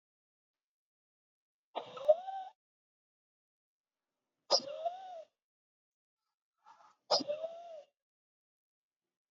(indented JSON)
{
  "exhalation_length": "9.3 s",
  "exhalation_amplitude": 6841,
  "exhalation_signal_mean_std_ratio": 0.24,
  "survey_phase": "beta (2021-08-13 to 2022-03-07)",
  "age": "65+",
  "gender": "Male",
  "wearing_mask": "No",
  "symptom_none": true,
  "symptom_onset": "12 days",
  "smoker_status": "Ex-smoker",
  "respiratory_condition_asthma": false,
  "respiratory_condition_other": false,
  "recruitment_source": "REACT",
  "submission_delay": "2 days",
  "covid_test_result": "Negative",
  "covid_test_method": "RT-qPCR",
  "influenza_a_test_result": "Negative",
  "influenza_b_test_result": "Negative"
}